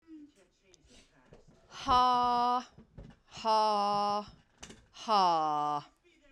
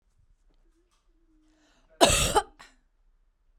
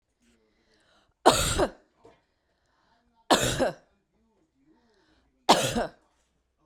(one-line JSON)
{"exhalation_length": "6.3 s", "exhalation_amplitude": 6071, "exhalation_signal_mean_std_ratio": 0.52, "cough_length": "3.6 s", "cough_amplitude": 30227, "cough_signal_mean_std_ratio": 0.26, "three_cough_length": "6.7 s", "three_cough_amplitude": 25530, "three_cough_signal_mean_std_ratio": 0.3, "survey_phase": "beta (2021-08-13 to 2022-03-07)", "age": "18-44", "gender": "Female", "wearing_mask": "No", "symptom_none": true, "smoker_status": "Ex-smoker", "respiratory_condition_asthma": false, "respiratory_condition_other": false, "recruitment_source": "REACT", "submission_delay": "1 day", "covid_test_result": "Negative", "covid_test_method": "RT-qPCR", "influenza_a_test_result": "Negative", "influenza_b_test_result": "Negative"}